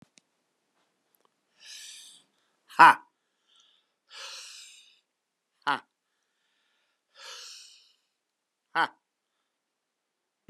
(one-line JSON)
{"exhalation_length": "10.5 s", "exhalation_amplitude": 25402, "exhalation_signal_mean_std_ratio": 0.14, "survey_phase": "beta (2021-08-13 to 2022-03-07)", "age": "45-64", "gender": "Male", "wearing_mask": "No", "symptom_none": true, "smoker_status": "Never smoked", "respiratory_condition_asthma": false, "respiratory_condition_other": false, "recruitment_source": "REACT", "submission_delay": "1 day", "covid_test_result": "Negative", "covid_test_method": "RT-qPCR"}